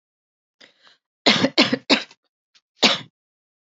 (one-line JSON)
{"cough_length": "3.7 s", "cough_amplitude": 32767, "cough_signal_mean_std_ratio": 0.31, "survey_phase": "beta (2021-08-13 to 2022-03-07)", "age": "18-44", "gender": "Female", "wearing_mask": "No", "symptom_none": true, "smoker_status": "Never smoked", "respiratory_condition_asthma": false, "respiratory_condition_other": false, "recruitment_source": "REACT", "submission_delay": "3 days", "covid_test_result": "Negative", "covid_test_method": "RT-qPCR", "influenza_a_test_result": "Unknown/Void", "influenza_b_test_result": "Unknown/Void"}